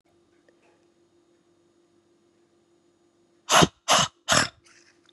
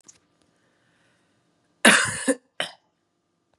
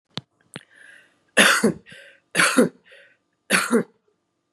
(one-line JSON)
{"exhalation_length": "5.1 s", "exhalation_amplitude": 23959, "exhalation_signal_mean_std_ratio": 0.25, "cough_length": "3.6 s", "cough_amplitude": 32767, "cough_signal_mean_std_ratio": 0.25, "three_cough_length": "4.5 s", "three_cough_amplitude": 31477, "three_cough_signal_mean_std_ratio": 0.37, "survey_phase": "beta (2021-08-13 to 2022-03-07)", "age": "45-64", "gender": "Female", "wearing_mask": "No", "symptom_none": true, "smoker_status": "Never smoked", "respiratory_condition_asthma": true, "respiratory_condition_other": false, "recruitment_source": "REACT", "submission_delay": "3 days", "covid_test_result": "Negative", "covid_test_method": "RT-qPCR", "influenza_a_test_result": "Negative", "influenza_b_test_result": "Negative"}